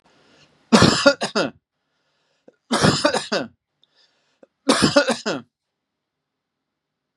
three_cough_length: 7.2 s
three_cough_amplitude: 32627
three_cough_signal_mean_std_ratio: 0.36
survey_phase: beta (2021-08-13 to 2022-03-07)
age: 45-64
gender: Male
wearing_mask: 'No'
symptom_none: true
smoker_status: Never smoked
respiratory_condition_asthma: false
respiratory_condition_other: false
recruitment_source: REACT
submission_delay: 3 days
covid_test_result: Negative
covid_test_method: RT-qPCR
influenza_a_test_result: Negative
influenza_b_test_result: Negative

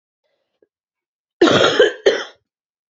cough_length: 3.0 s
cough_amplitude: 29798
cough_signal_mean_std_ratio: 0.37
survey_phase: beta (2021-08-13 to 2022-03-07)
age: 18-44
gender: Female
wearing_mask: 'No'
symptom_cough_any: true
symptom_new_continuous_cough: true
symptom_runny_or_blocked_nose: true
symptom_shortness_of_breath: true
symptom_sore_throat: true
symptom_fatigue: true
symptom_fever_high_temperature: true
symptom_headache: true
symptom_change_to_sense_of_smell_or_taste: true
symptom_other: true
symptom_onset: 2 days
smoker_status: Never smoked
respiratory_condition_asthma: false
respiratory_condition_other: false
recruitment_source: Test and Trace
submission_delay: 2 days
covid_test_result: Positive
covid_test_method: RT-qPCR
covid_ct_value: 30.2
covid_ct_gene: ORF1ab gene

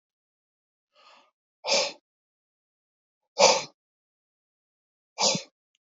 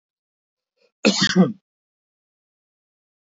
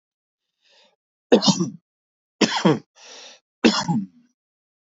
exhalation_length: 5.8 s
exhalation_amplitude: 21319
exhalation_signal_mean_std_ratio: 0.25
cough_length: 3.3 s
cough_amplitude: 25691
cough_signal_mean_std_ratio: 0.26
three_cough_length: 4.9 s
three_cough_amplitude: 26771
three_cough_signal_mean_std_ratio: 0.34
survey_phase: beta (2021-08-13 to 2022-03-07)
age: 45-64
gender: Male
wearing_mask: 'No'
symptom_diarrhoea: true
symptom_headache: true
smoker_status: Ex-smoker
respiratory_condition_asthma: false
respiratory_condition_other: false
recruitment_source: REACT
submission_delay: 1 day
covid_test_result: Negative
covid_test_method: RT-qPCR
influenza_a_test_result: Negative
influenza_b_test_result: Negative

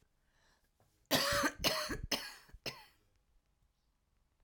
cough_length: 4.4 s
cough_amplitude: 4449
cough_signal_mean_std_ratio: 0.39
survey_phase: alpha (2021-03-01 to 2021-08-12)
age: 45-64
gender: Female
wearing_mask: 'No'
symptom_cough_any: true
symptom_shortness_of_breath: true
symptom_fatigue: true
symptom_fever_high_temperature: true
symptom_headache: true
symptom_change_to_sense_of_smell_or_taste: true
symptom_loss_of_taste: true
symptom_onset: 2 days
smoker_status: Never smoked
respiratory_condition_asthma: false
respiratory_condition_other: false
recruitment_source: Test and Trace
submission_delay: 2 days
covid_test_result: Positive
covid_test_method: RT-qPCR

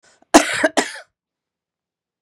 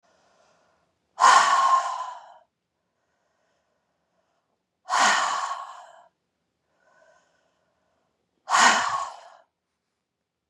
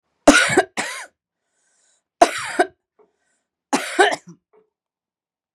cough_length: 2.2 s
cough_amplitude: 32768
cough_signal_mean_std_ratio: 0.28
exhalation_length: 10.5 s
exhalation_amplitude: 21748
exhalation_signal_mean_std_ratio: 0.34
three_cough_length: 5.5 s
three_cough_amplitude: 32768
three_cough_signal_mean_std_ratio: 0.31
survey_phase: beta (2021-08-13 to 2022-03-07)
age: 45-64
gender: Female
wearing_mask: 'No'
symptom_none: true
smoker_status: Never smoked
respiratory_condition_asthma: false
respiratory_condition_other: false
recruitment_source: Test and Trace
submission_delay: 2 days
covid_test_result: Negative
covid_test_method: RT-qPCR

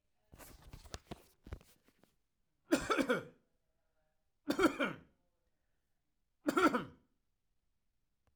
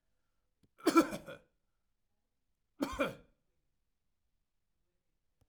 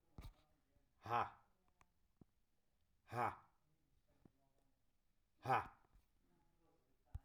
three_cough_length: 8.4 s
three_cough_amplitude: 4892
three_cough_signal_mean_std_ratio: 0.3
cough_length: 5.5 s
cough_amplitude: 7100
cough_signal_mean_std_ratio: 0.21
exhalation_length: 7.2 s
exhalation_amplitude: 1613
exhalation_signal_mean_std_ratio: 0.26
survey_phase: alpha (2021-03-01 to 2021-08-12)
age: 45-64
gender: Male
wearing_mask: 'No'
symptom_none: true
smoker_status: Never smoked
respiratory_condition_asthma: false
respiratory_condition_other: false
recruitment_source: REACT
submission_delay: 1 day
covid_test_result: Negative
covid_test_method: RT-qPCR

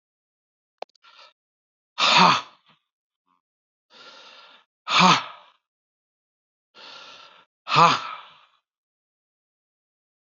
exhalation_length: 10.3 s
exhalation_amplitude: 26696
exhalation_signal_mean_std_ratio: 0.26
survey_phase: beta (2021-08-13 to 2022-03-07)
age: 45-64
gender: Male
wearing_mask: 'No'
symptom_cough_any: true
symptom_onset: 3 days
smoker_status: Ex-smoker
respiratory_condition_asthma: false
respiratory_condition_other: false
recruitment_source: Test and Trace
submission_delay: 2 days
covid_test_result: Negative
covid_test_method: RT-qPCR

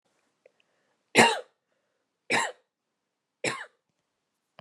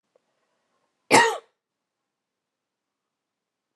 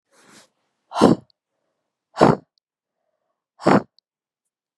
three_cough_length: 4.6 s
three_cough_amplitude: 21170
three_cough_signal_mean_std_ratio: 0.24
cough_length: 3.8 s
cough_amplitude: 29984
cough_signal_mean_std_ratio: 0.19
exhalation_length: 4.8 s
exhalation_amplitude: 32767
exhalation_signal_mean_std_ratio: 0.25
survey_phase: beta (2021-08-13 to 2022-03-07)
age: 18-44
gender: Female
wearing_mask: 'No'
symptom_cough_any: true
symptom_runny_or_blocked_nose: true
symptom_change_to_sense_of_smell_or_taste: true
smoker_status: Never smoked
respiratory_condition_asthma: false
respiratory_condition_other: false
recruitment_source: Test and Trace
submission_delay: 2 days
covid_test_result: Positive
covid_test_method: ePCR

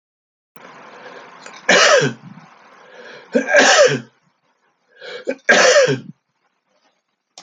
three_cough_length: 7.4 s
three_cough_amplitude: 32767
three_cough_signal_mean_std_ratio: 0.41
survey_phase: alpha (2021-03-01 to 2021-08-12)
age: 65+
gender: Male
wearing_mask: 'No'
symptom_fatigue: true
symptom_headache: true
smoker_status: Never smoked
respiratory_condition_asthma: false
respiratory_condition_other: false
recruitment_source: Test and Trace
submission_delay: 3 days
covid_test_result: Positive
covid_test_method: RT-qPCR
covid_ct_value: 13.8
covid_ct_gene: ORF1ab gene
covid_ct_mean: 14.8
covid_viral_load: 14000000 copies/ml
covid_viral_load_category: High viral load (>1M copies/ml)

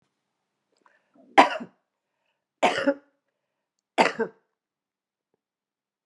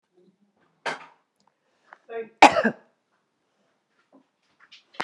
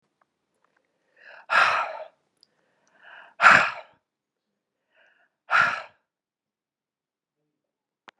three_cough_length: 6.1 s
three_cough_amplitude: 31763
three_cough_signal_mean_std_ratio: 0.22
cough_length: 5.0 s
cough_amplitude: 32767
cough_signal_mean_std_ratio: 0.18
exhalation_length: 8.2 s
exhalation_amplitude: 31853
exhalation_signal_mean_std_ratio: 0.26
survey_phase: beta (2021-08-13 to 2022-03-07)
age: 65+
gender: Female
wearing_mask: 'No'
symptom_none: true
smoker_status: Ex-smoker
respiratory_condition_asthma: false
respiratory_condition_other: false
recruitment_source: REACT
submission_delay: 1 day
covid_test_result: Negative
covid_test_method: RT-qPCR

